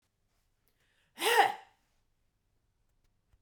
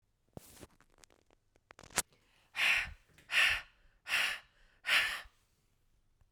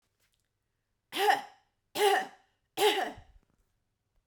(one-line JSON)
{"cough_length": "3.4 s", "cough_amplitude": 9136, "cough_signal_mean_std_ratio": 0.24, "exhalation_length": "6.3 s", "exhalation_amplitude": 12958, "exhalation_signal_mean_std_ratio": 0.37, "three_cough_length": "4.3 s", "three_cough_amplitude": 8608, "three_cough_signal_mean_std_ratio": 0.36, "survey_phase": "beta (2021-08-13 to 2022-03-07)", "age": "45-64", "gender": "Female", "wearing_mask": "No", "symptom_none": true, "smoker_status": "Never smoked", "respiratory_condition_asthma": false, "respiratory_condition_other": false, "recruitment_source": "REACT", "submission_delay": "1 day", "covid_test_result": "Negative", "covid_test_method": "RT-qPCR"}